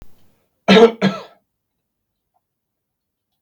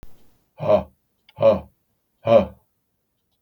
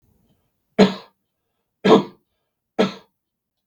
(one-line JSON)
{"cough_length": "3.4 s", "cough_amplitude": 32768, "cough_signal_mean_std_ratio": 0.26, "exhalation_length": "3.4 s", "exhalation_amplitude": 26443, "exhalation_signal_mean_std_ratio": 0.33, "three_cough_length": "3.7 s", "three_cough_amplitude": 32768, "three_cough_signal_mean_std_ratio": 0.26, "survey_phase": "beta (2021-08-13 to 2022-03-07)", "age": "65+", "gender": "Male", "wearing_mask": "No", "symptom_cough_any": true, "smoker_status": "Never smoked", "respiratory_condition_asthma": false, "respiratory_condition_other": false, "recruitment_source": "REACT", "submission_delay": "1 day", "covid_test_result": "Negative", "covid_test_method": "RT-qPCR", "influenza_a_test_result": "Negative", "influenza_b_test_result": "Negative"}